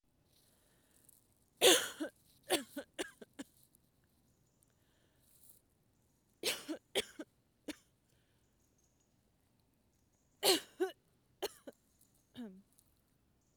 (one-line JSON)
{"three_cough_length": "13.6 s", "three_cough_amplitude": 9765, "three_cough_signal_mean_std_ratio": 0.23, "survey_phase": "beta (2021-08-13 to 2022-03-07)", "age": "18-44", "gender": "Female", "wearing_mask": "No", "symptom_none": true, "smoker_status": "Never smoked", "respiratory_condition_asthma": false, "respiratory_condition_other": false, "recruitment_source": "REACT", "submission_delay": "2 days", "covid_test_result": "Negative", "covid_test_method": "RT-qPCR"}